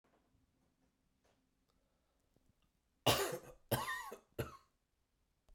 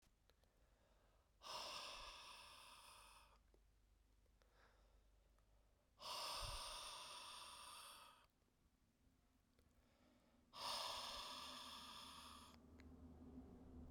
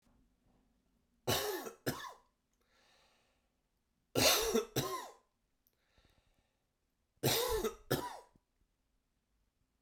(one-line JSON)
{"cough_length": "5.5 s", "cough_amplitude": 3690, "cough_signal_mean_std_ratio": 0.28, "exhalation_length": "13.9 s", "exhalation_amplitude": 499, "exhalation_signal_mean_std_ratio": 0.63, "three_cough_length": "9.8 s", "three_cough_amplitude": 5534, "three_cough_signal_mean_std_ratio": 0.35, "survey_phase": "beta (2021-08-13 to 2022-03-07)", "age": "45-64", "gender": "Male", "wearing_mask": "No", "symptom_cough_any": true, "symptom_runny_or_blocked_nose": true, "symptom_fatigue": true, "symptom_change_to_sense_of_smell_or_taste": true, "symptom_loss_of_taste": true, "symptom_onset": "3 days", "smoker_status": "Never smoked", "respiratory_condition_asthma": false, "respiratory_condition_other": false, "recruitment_source": "Test and Trace", "submission_delay": "2 days", "covid_test_result": "Positive", "covid_test_method": "RT-qPCR"}